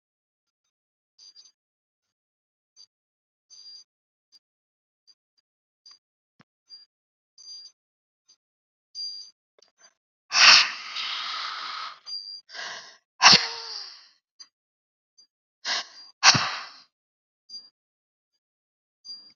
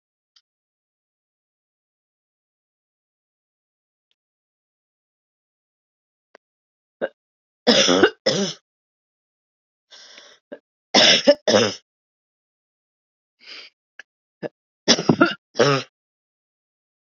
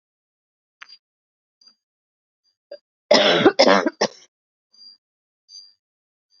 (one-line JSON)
{"exhalation_length": "19.4 s", "exhalation_amplitude": 32106, "exhalation_signal_mean_std_ratio": 0.22, "three_cough_length": "17.1 s", "three_cough_amplitude": 32768, "three_cough_signal_mean_std_ratio": 0.25, "cough_length": "6.4 s", "cough_amplitude": 30722, "cough_signal_mean_std_ratio": 0.27, "survey_phase": "alpha (2021-03-01 to 2021-08-12)", "age": "45-64", "gender": "Female", "wearing_mask": "No", "symptom_fatigue": true, "symptom_headache": true, "symptom_onset": "2 days", "smoker_status": "Never smoked", "respiratory_condition_asthma": false, "respiratory_condition_other": false, "recruitment_source": "Test and Trace", "submission_delay": "2 days", "covid_test_result": "Positive", "covid_test_method": "RT-qPCR"}